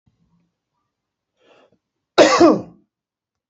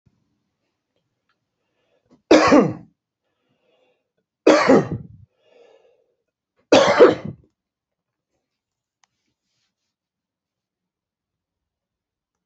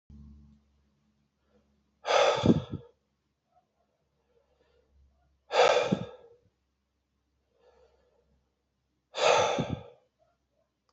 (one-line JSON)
{"cough_length": "3.5 s", "cough_amplitude": 29923, "cough_signal_mean_std_ratio": 0.27, "three_cough_length": "12.5 s", "three_cough_amplitude": 32768, "three_cough_signal_mean_std_ratio": 0.24, "exhalation_length": "10.9 s", "exhalation_amplitude": 12034, "exhalation_signal_mean_std_ratio": 0.3, "survey_phase": "alpha (2021-03-01 to 2021-08-12)", "age": "45-64", "gender": "Male", "wearing_mask": "No", "symptom_none": true, "smoker_status": "Never smoked", "respiratory_condition_asthma": false, "respiratory_condition_other": false, "recruitment_source": "REACT", "submission_delay": "2 days", "covid_test_result": "Negative", "covid_test_method": "RT-qPCR"}